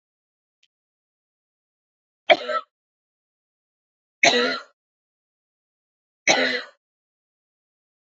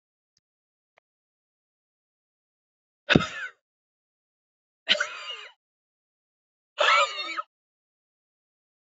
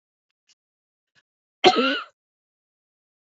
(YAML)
three_cough_length: 8.2 s
three_cough_amplitude: 27037
three_cough_signal_mean_std_ratio: 0.23
exhalation_length: 8.9 s
exhalation_amplitude: 27243
exhalation_signal_mean_std_ratio: 0.24
cough_length: 3.3 s
cough_amplitude: 27211
cough_signal_mean_std_ratio: 0.23
survey_phase: alpha (2021-03-01 to 2021-08-12)
age: 45-64
gender: Female
wearing_mask: 'No'
symptom_none: true
smoker_status: Never smoked
respiratory_condition_asthma: false
respiratory_condition_other: false
recruitment_source: REACT
submission_delay: 2 days
covid_test_result: Negative
covid_test_method: RT-qPCR